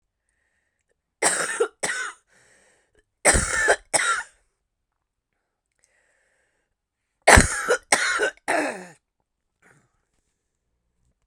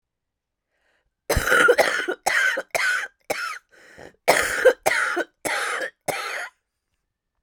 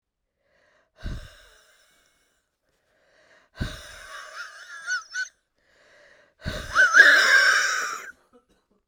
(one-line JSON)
{"three_cough_length": "11.3 s", "three_cough_amplitude": 32768, "three_cough_signal_mean_std_ratio": 0.33, "cough_length": "7.4 s", "cough_amplitude": 26334, "cough_signal_mean_std_ratio": 0.51, "exhalation_length": "8.9 s", "exhalation_amplitude": 29113, "exhalation_signal_mean_std_ratio": 0.35, "survey_phase": "beta (2021-08-13 to 2022-03-07)", "age": "45-64", "gender": "Female", "wearing_mask": "No", "symptom_cough_any": true, "symptom_sore_throat": true, "symptom_fatigue": true, "symptom_fever_high_temperature": true, "symptom_headache": true, "symptom_onset": "2 days", "smoker_status": "Ex-smoker", "respiratory_condition_asthma": false, "respiratory_condition_other": false, "recruitment_source": "Test and Trace", "submission_delay": "2 days", "covid_test_result": "Positive", "covid_test_method": "RT-qPCR", "covid_ct_value": 26.8, "covid_ct_gene": "ORF1ab gene", "covid_ct_mean": 27.5, "covid_viral_load": "940 copies/ml", "covid_viral_load_category": "Minimal viral load (< 10K copies/ml)"}